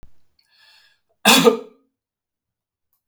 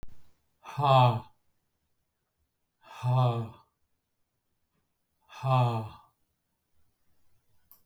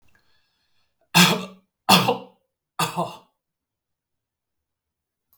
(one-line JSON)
{"cough_length": "3.1 s", "cough_amplitude": 32768, "cough_signal_mean_std_ratio": 0.26, "exhalation_length": "7.9 s", "exhalation_amplitude": 10899, "exhalation_signal_mean_std_ratio": 0.35, "three_cough_length": "5.4 s", "three_cough_amplitude": 32766, "three_cough_signal_mean_std_ratio": 0.28, "survey_phase": "beta (2021-08-13 to 2022-03-07)", "age": "65+", "gender": "Male", "wearing_mask": "No", "symptom_none": true, "smoker_status": "Never smoked", "respiratory_condition_asthma": false, "respiratory_condition_other": false, "recruitment_source": "Test and Trace", "submission_delay": "1 day", "covid_test_result": "Negative", "covid_test_method": "RT-qPCR"}